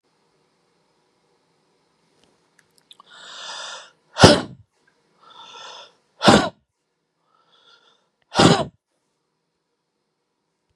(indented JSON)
{
  "exhalation_length": "10.8 s",
  "exhalation_amplitude": 32768,
  "exhalation_signal_mean_std_ratio": 0.21,
  "survey_phase": "beta (2021-08-13 to 2022-03-07)",
  "age": "45-64",
  "gender": "Male",
  "wearing_mask": "No",
  "symptom_runny_or_blocked_nose": true,
  "smoker_status": "Never smoked",
  "respiratory_condition_asthma": false,
  "respiratory_condition_other": false,
  "recruitment_source": "REACT",
  "submission_delay": "4 days",
  "covid_test_result": "Negative",
  "covid_test_method": "RT-qPCR",
  "influenza_a_test_result": "Negative",
  "influenza_b_test_result": "Negative"
}